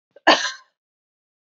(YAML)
cough_length: 1.5 s
cough_amplitude: 28272
cough_signal_mean_std_ratio: 0.27
survey_phase: beta (2021-08-13 to 2022-03-07)
age: 18-44
gender: Female
wearing_mask: 'No'
symptom_cough_any: true
symptom_runny_or_blocked_nose: true
symptom_sore_throat: true
symptom_onset: 6 days
smoker_status: Never smoked
respiratory_condition_asthma: false
respiratory_condition_other: false
recruitment_source: Test and Trace
submission_delay: 2 days
covid_test_result: Positive
covid_test_method: RT-qPCR
covid_ct_value: 25.0
covid_ct_gene: N gene